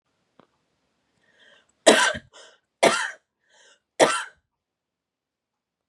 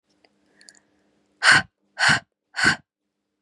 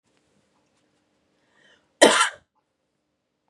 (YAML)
three_cough_length: 5.9 s
three_cough_amplitude: 28702
three_cough_signal_mean_std_ratio: 0.26
exhalation_length: 3.4 s
exhalation_amplitude: 28739
exhalation_signal_mean_std_ratio: 0.32
cough_length: 3.5 s
cough_amplitude: 32767
cough_signal_mean_std_ratio: 0.2
survey_phase: beta (2021-08-13 to 2022-03-07)
age: 18-44
gender: Female
wearing_mask: 'No'
symptom_none: true
smoker_status: Never smoked
respiratory_condition_asthma: false
respiratory_condition_other: false
recruitment_source: REACT
submission_delay: 1 day
covid_test_result: Negative
covid_test_method: RT-qPCR
influenza_a_test_result: Negative
influenza_b_test_result: Negative